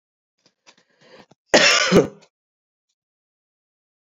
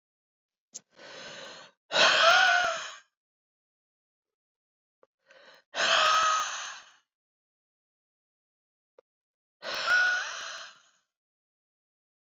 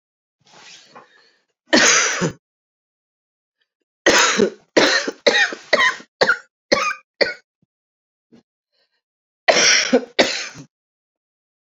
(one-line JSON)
{"cough_length": "4.1 s", "cough_amplitude": 28739, "cough_signal_mean_std_ratio": 0.28, "exhalation_length": "12.2 s", "exhalation_amplitude": 13050, "exhalation_signal_mean_std_ratio": 0.38, "three_cough_length": "11.6 s", "three_cough_amplitude": 32768, "three_cough_signal_mean_std_ratio": 0.4, "survey_phase": "beta (2021-08-13 to 2022-03-07)", "age": "45-64", "gender": "Female", "wearing_mask": "No", "symptom_cough_any": true, "symptom_runny_or_blocked_nose": true, "symptom_sore_throat": true, "symptom_fatigue": true, "symptom_headache": true, "symptom_other": true, "symptom_onset": "5 days", "smoker_status": "Ex-smoker", "respiratory_condition_asthma": false, "respiratory_condition_other": false, "recruitment_source": "Test and Trace", "submission_delay": "2 days", "covid_test_result": "Positive", "covid_test_method": "RT-qPCR", "covid_ct_value": 15.5, "covid_ct_gene": "ORF1ab gene", "covid_ct_mean": 16.0, "covid_viral_load": "5600000 copies/ml", "covid_viral_load_category": "High viral load (>1M copies/ml)"}